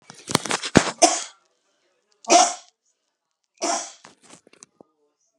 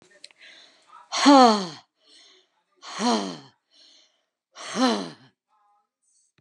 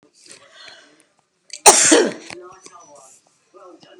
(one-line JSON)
{"three_cough_length": "5.4 s", "three_cough_amplitude": 32768, "three_cough_signal_mean_std_ratio": 0.29, "exhalation_length": "6.4 s", "exhalation_amplitude": 26491, "exhalation_signal_mean_std_ratio": 0.3, "cough_length": "4.0 s", "cough_amplitude": 32768, "cough_signal_mean_std_ratio": 0.29, "survey_phase": "alpha (2021-03-01 to 2021-08-12)", "age": "65+", "gender": "Female", "wearing_mask": "No", "symptom_none": true, "symptom_onset": "6 days", "smoker_status": "Ex-smoker", "respiratory_condition_asthma": false, "respiratory_condition_other": false, "recruitment_source": "REACT", "submission_delay": "1 day", "covid_test_result": "Negative", "covid_test_method": "RT-qPCR"}